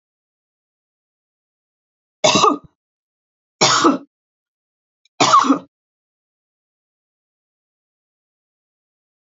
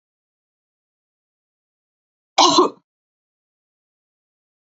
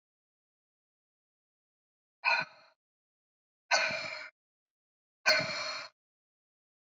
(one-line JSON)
{"three_cough_length": "9.3 s", "three_cough_amplitude": 29848, "three_cough_signal_mean_std_ratio": 0.26, "cough_length": "4.8 s", "cough_amplitude": 31909, "cough_signal_mean_std_ratio": 0.2, "exhalation_length": "6.9 s", "exhalation_amplitude": 7533, "exhalation_signal_mean_std_ratio": 0.3, "survey_phase": "beta (2021-08-13 to 2022-03-07)", "age": "65+", "gender": "Female", "wearing_mask": "No", "symptom_none": true, "smoker_status": "Never smoked", "respiratory_condition_asthma": false, "respiratory_condition_other": false, "recruitment_source": "REACT", "submission_delay": "2 days", "covid_test_result": "Negative", "covid_test_method": "RT-qPCR", "influenza_a_test_result": "Negative", "influenza_b_test_result": "Negative"}